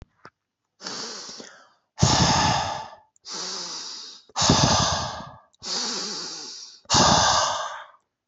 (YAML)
exhalation_length: 8.3 s
exhalation_amplitude: 26018
exhalation_signal_mean_std_ratio: 0.56
survey_phase: beta (2021-08-13 to 2022-03-07)
age: 45-64
gender: Male
wearing_mask: 'No'
symptom_none: true
smoker_status: Never smoked
respiratory_condition_asthma: false
respiratory_condition_other: false
recruitment_source: REACT
submission_delay: 1 day
covid_test_result: Negative
covid_test_method: RT-qPCR